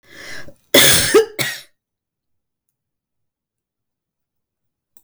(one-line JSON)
{"cough_length": "5.0 s", "cough_amplitude": 32768, "cough_signal_mean_std_ratio": 0.29, "survey_phase": "beta (2021-08-13 to 2022-03-07)", "age": "65+", "gender": "Female", "wearing_mask": "No", "symptom_none": true, "smoker_status": "Ex-smoker", "respiratory_condition_asthma": false, "respiratory_condition_other": false, "recruitment_source": "REACT", "submission_delay": "1 day", "covid_test_result": "Negative", "covid_test_method": "RT-qPCR", "influenza_a_test_result": "Negative", "influenza_b_test_result": "Negative"}